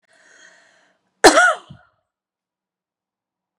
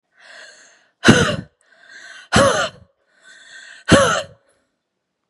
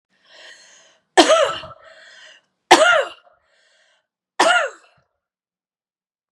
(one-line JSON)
{"cough_length": "3.6 s", "cough_amplitude": 32768, "cough_signal_mean_std_ratio": 0.23, "exhalation_length": "5.3 s", "exhalation_amplitude": 32768, "exhalation_signal_mean_std_ratio": 0.36, "three_cough_length": "6.3 s", "three_cough_amplitude": 32768, "three_cough_signal_mean_std_ratio": 0.32, "survey_phase": "beta (2021-08-13 to 2022-03-07)", "age": "45-64", "gender": "Female", "wearing_mask": "No", "symptom_none": true, "symptom_onset": "3 days", "smoker_status": "Never smoked", "respiratory_condition_asthma": false, "respiratory_condition_other": false, "recruitment_source": "REACT", "submission_delay": "1 day", "covid_test_result": "Negative", "covid_test_method": "RT-qPCR", "influenza_a_test_result": "Negative", "influenza_b_test_result": "Negative"}